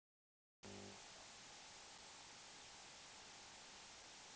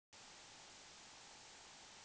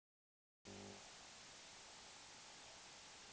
{"exhalation_length": "4.4 s", "exhalation_amplitude": 280, "exhalation_signal_mean_std_ratio": 1.13, "cough_length": "2.0 s", "cough_amplitude": 125, "cough_signal_mean_std_ratio": 1.32, "three_cough_length": "3.3 s", "three_cough_amplitude": 204, "three_cough_signal_mean_std_ratio": 1.04, "survey_phase": "beta (2021-08-13 to 2022-03-07)", "age": "45-64", "gender": "Male", "wearing_mask": "No", "symptom_none": true, "smoker_status": "Never smoked", "respiratory_condition_asthma": false, "respiratory_condition_other": false, "recruitment_source": "REACT", "submission_delay": "4 days", "covid_test_result": "Negative", "covid_test_method": "RT-qPCR"}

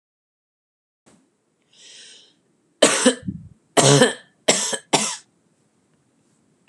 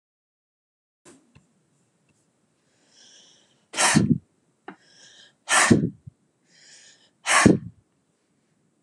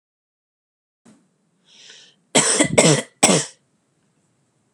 {"three_cough_length": "6.7 s", "three_cough_amplitude": 32768, "three_cough_signal_mean_std_ratio": 0.32, "exhalation_length": "8.8 s", "exhalation_amplitude": 30648, "exhalation_signal_mean_std_ratio": 0.28, "cough_length": "4.7 s", "cough_amplitude": 32768, "cough_signal_mean_std_ratio": 0.32, "survey_phase": "beta (2021-08-13 to 2022-03-07)", "age": "18-44", "gender": "Female", "wearing_mask": "No", "symptom_cough_any": true, "symptom_runny_or_blocked_nose": true, "symptom_shortness_of_breath": true, "symptom_fatigue": true, "symptom_headache": true, "smoker_status": "Never smoked", "respiratory_condition_asthma": false, "respiratory_condition_other": false, "recruitment_source": "REACT", "submission_delay": "14 days", "covid_test_result": "Negative", "covid_test_method": "RT-qPCR", "influenza_a_test_result": "Negative", "influenza_b_test_result": "Negative"}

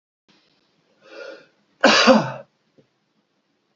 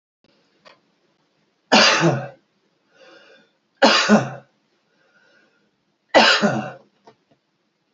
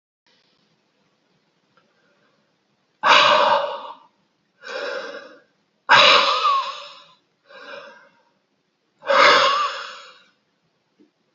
{"cough_length": "3.8 s", "cough_amplitude": 32767, "cough_signal_mean_std_ratio": 0.29, "three_cough_length": "7.9 s", "three_cough_amplitude": 29256, "three_cough_signal_mean_std_ratio": 0.34, "exhalation_length": "11.3 s", "exhalation_amplitude": 29467, "exhalation_signal_mean_std_ratio": 0.38, "survey_phase": "beta (2021-08-13 to 2022-03-07)", "age": "65+", "gender": "Male", "wearing_mask": "No", "symptom_runny_or_blocked_nose": true, "smoker_status": "Never smoked", "respiratory_condition_asthma": false, "respiratory_condition_other": false, "recruitment_source": "REACT", "submission_delay": "6 days", "covid_test_result": "Negative", "covid_test_method": "RT-qPCR", "influenza_a_test_result": "Negative", "influenza_b_test_result": "Negative"}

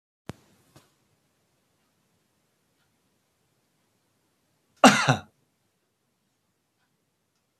{"cough_length": "7.6 s", "cough_amplitude": 26215, "cough_signal_mean_std_ratio": 0.14, "survey_phase": "beta (2021-08-13 to 2022-03-07)", "age": "65+", "gender": "Male", "wearing_mask": "No", "symptom_none": true, "smoker_status": "Never smoked", "respiratory_condition_asthma": false, "respiratory_condition_other": false, "recruitment_source": "REACT", "submission_delay": "2 days", "covid_test_result": "Negative", "covid_test_method": "RT-qPCR", "influenza_a_test_result": "Unknown/Void", "influenza_b_test_result": "Unknown/Void"}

